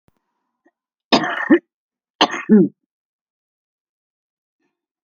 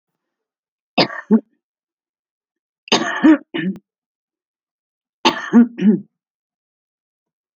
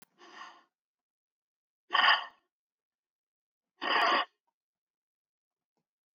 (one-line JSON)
{"cough_length": "5.0 s", "cough_amplitude": 32768, "cough_signal_mean_std_ratio": 0.27, "three_cough_length": "7.6 s", "three_cough_amplitude": 31039, "three_cough_signal_mean_std_ratio": 0.3, "exhalation_length": "6.1 s", "exhalation_amplitude": 9961, "exhalation_signal_mean_std_ratio": 0.27, "survey_phase": "alpha (2021-03-01 to 2021-08-12)", "age": "65+", "gender": "Female", "wearing_mask": "No", "symptom_none": true, "smoker_status": "Ex-smoker", "respiratory_condition_asthma": true, "respiratory_condition_other": true, "recruitment_source": "REACT", "submission_delay": "1 day", "covid_test_result": "Negative", "covid_test_method": "RT-qPCR"}